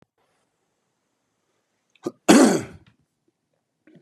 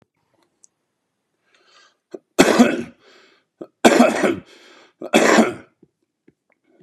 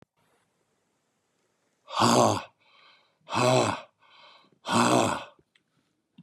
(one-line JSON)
{"cough_length": "4.0 s", "cough_amplitude": 32767, "cough_signal_mean_std_ratio": 0.23, "three_cough_length": "6.8 s", "three_cough_amplitude": 32768, "three_cough_signal_mean_std_ratio": 0.34, "exhalation_length": "6.2 s", "exhalation_amplitude": 13553, "exhalation_signal_mean_std_ratio": 0.38, "survey_phase": "beta (2021-08-13 to 2022-03-07)", "age": "45-64", "gender": "Male", "wearing_mask": "No", "symptom_none": true, "smoker_status": "Current smoker (11 or more cigarettes per day)", "respiratory_condition_asthma": false, "respiratory_condition_other": false, "recruitment_source": "Test and Trace", "submission_delay": "2 days", "covid_test_result": "Negative", "covid_test_method": "RT-qPCR"}